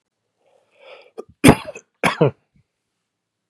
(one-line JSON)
{"cough_length": "3.5 s", "cough_amplitude": 32768, "cough_signal_mean_std_ratio": 0.23, "survey_phase": "beta (2021-08-13 to 2022-03-07)", "age": "45-64", "gender": "Male", "wearing_mask": "No", "symptom_cough_any": true, "symptom_runny_or_blocked_nose": true, "symptom_sore_throat": true, "symptom_headache": true, "symptom_onset": "3 days", "smoker_status": "Never smoked", "respiratory_condition_asthma": false, "respiratory_condition_other": false, "recruitment_source": "Test and Trace", "submission_delay": "1 day", "covid_test_result": "Positive", "covid_test_method": "ePCR"}